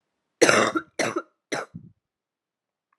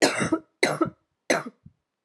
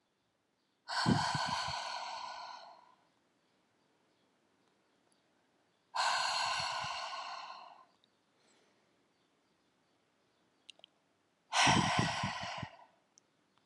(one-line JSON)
{"cough_length": "3.0 s", "cough_amplitude": 32768, "cough_signal_mean_std_ratio": 0.33, "three_cough_length": "2.0 s", "three_cough_amplitude": 21356, "three_cough_signal_mean_std_ratio": 0.45, "exhalation_length": "13.7 s", "exhalation_amplitude": 5115, "exhalation_signal_mean_std_ratio": 0.42, "survey_phase": "alpha (2021-03-01 to 2021-08-12)", "age": "18-44", "gender": "Female", "wearing_mask": "No", "symptom_cough_any": true, "symptom_fatigue": true, "symptom_headache": true, "symptom_onset": "3 days", "smoker_status": "Never smoked", "respiratory_condition_asthma": false, "respiratory_condition_other": false, "recruitment_source": "Test and Trace", "submission_delay": "1 day", "covid_test_result": "Positive", "covid_test_method": "RT-qPCR"}